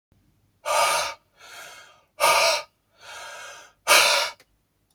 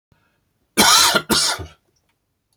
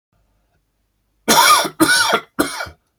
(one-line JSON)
{"exhalation_length": "4.9 s", "exhalation_amplitude": 23061, "exhalation_signal_mean_std_ratio": 0.44, "cough_length": "2.6 s", "cough_amplitude": 32768, "cough_signal_mean_std_ratio": 0.43, "three_cough_length": "3.0 s", "three_cough_amplitude": 32768, "three_cough_signal_mean_std_ratio": 0.47, "survey_phase": "beta (2021-08-13 to 2022-03-07)", "age": "65+", "gender": "Male", "wearing_mask": "No", "symptom_none": true, "symptom_onset": "8 days", "smoker_status": "Never smoked", "respiratory_condition_asthma": false, "respiratory_condition_other": false, "recruitment_source": "REACT", "submission_delay": "0 days", "covid_test_result": "Negative", "covid_test_method": "RT-qPCR", "influenza_a_test_result": "Unknown/Void", "influenza_b_test_result": "Unknown/Void"}